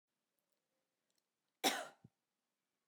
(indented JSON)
{
  "cough_length": "2.9 s",
  "cough_amplitude": 3226,
  "cough_signal_mean_std_ratio": 0.19,
  "survey_phase": "beta (2021-08-13 to 2022-03-07)",
  "age": "45-64",
  "gender": "Female",
  "wearing_mask": "No",
  "symptom_none": true,
  "smoker_status": "Never smoked",
  "respiratory_condition_asthma": false,
  "respiratory_condition_other": false,
  "recruitment_source": "REACT",
  "submission_delay": "1 day",
  "covid_test_result": "Negative",
  "covid_test_method": "RT-qPCR",
  "influenza_a_test_result": "Unknown/Void",
  "influenza_b_test_result": "Unknown/Void"
}